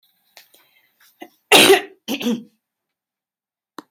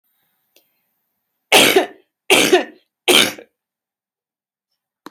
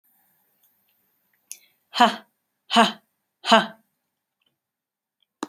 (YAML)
cough_length: 3.9 s
cough_amplitude: 30970
cough_signal_mean_std_ratio: 0.28
three_cough_length: 5.1 s
three_cough_amplitude: 32174
three_cough_signal_mean_std_ratio: 0.33
exhalation_length: 5.5 s
exhalation_amplitude: 28528
exhalation_signal_mean_std_ratio: 0.23
survey_phase: beta (2021-08-13 to 2022-03-07)
age: 18-44
gender: Female
wearing_mask: 'No'
symptom_none: true
smoker_status: Never smoked
respiratory_condition_asthma: false
respiratory_condition_other: false
recruitment_source: REACT
submission_delay: 2 days
covid_test_result: Negative
covid_test_method: RT-qPCR
influenza_a_test_result: Negative
influenza_b_test_result: Negative